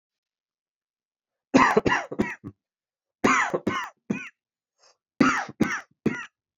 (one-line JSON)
{"three_cough_length": "6.6 s", "three_cough_amplitude": 21393, "three_cough_signal_mean_std_ratio": 0.38, "survey_phase": "beta (2021-08-13 to 2022-03-07)", "age": "18-44", "gender": "Male", "wearing_mask": "Yes", "symptom_cough_any": true, "symptom_new_continuous_cough": true, "symptom_runny_or_blocked_nose": true, "symptom_shortness_of_breath": true, "symptom_sore_throat": true, "symptom_fever_high_temperature": true, "symptom_headache": true, "symptom_change_to_sense_of_smell_or_taste": true, "symptom_onset": "3 days", "smoker_status": "Never smoked", "respiratory_condition_asthma": false, "respiratory_condition_other": false, "recruitment_source": "Test and Trace", "submission_delay": "2 days", "covid_test_result": "Positive", "covid_test_method": "RT-qPCR", "covid_ct_value": 18.8, "covid_ct_gene": "ORF1ab gene", "covid_ct_mean": 19.7, "covid_viral_load": "330000 copies/ml", "covid_viral_load_category": "Low viral load (10K-1M copies/ml)"}